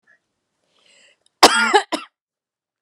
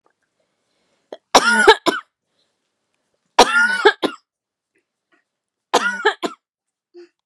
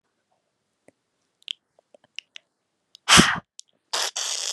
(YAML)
cough_length: 2.8 s
cough_amplitude: 32768
cough_signal_mean_std_ratio: 0.27
three_cough_length: 7.3 s
three_cough_amplitude: 32768
three_cough_signal_mean_std_ratio: 0.32
exhalation_length: 4.5 s
exhalation_amplitude: 32580
exhalation_signal_mean_std_ratio: 0.25
survey_phase: beta (2021-08-13 to 2022-03-07)
age: 18-44
gender: Female
wearing_mask: 'No'
symptom_none: true
smoker_status: Never smoked
respiratory_condition_asthma: false
respiratory_condition_other: false
recruitment_source: REACT
submission_delay: 2 days
covid_test_result: Negative
covid_test_method: RT-qPCR
influenza_a_test_result: Negative
influenza_b_test_result: Negative